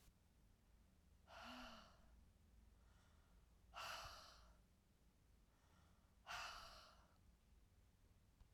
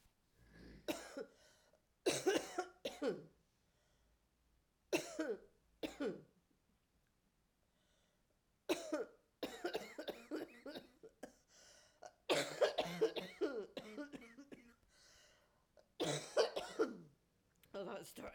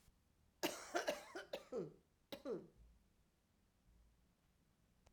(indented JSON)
{
  "exhalation_length": "8.5 s",
  "exhalation_amplitude": 368,
  "exhalation_signal_mean_std_ratio": 0.61,
  "three_cough_length": "18.3 s",
  "three_cough_amplitude": 2823,
  "three_cough_signal_mean_std_ratio": 0.41,
  "cough_length": "5.1 s",
  "cough_amplitude": 1698,
  "cough_signal_mean_std_ratio": 0.38,
  "survey_phase": "beta (2021-08-13 to 2022-03-07)",
  "age": "45-64",
  "gender": "Female",
  "wearing_mask": "No",
  "symptom_cough_any": true,
  "symptom_sore_throat": true,
  "symptom_fatigue": true,
  "symptom_fever_high_temperature": true,
  "symptom_headache": true,
  "symptom_loss_of_taste": true,
  "symptom_onset": "6 days",
  "smoker_status": "Ex-smoker",
  "respiratory_condition_asthma": false,
  "respiratory_condition_other": false,
  "recruitment_source": "Test and Trace",
  "submission_delay": "2 days",
  "covid_test_result": "Positive",
  "covid_test_method": "RT-qPCR",
  "covid_ct_value": 20.9,
  "covid_ct_gene": "ORF1ab gene"
}